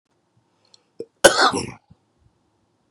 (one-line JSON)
{"three_cough_length": "2.9 s", "three_cough_amplitude": 32768, "three_cough_signal_mean_std_ratio": 0.25, "survey_phase": "beta (2021-08-13 to 2022-03-07)", "age": "45-64", "gender": "Male", "wearing_mask": "No", "symptom_none": true, "smoker_status": "Current smoker (11 or more cigarettes per day)", "respiratory_condition_asthma": false, "respiratory_condition_other": false, "recruitment_source": "REACT", "submission_delay": "2 days", "covid_test_result": "Negative", "covid_test_method": "RT-qPCR", "influenza_a_test_result": "Negative", "influenza_b_test_result": "Negative"}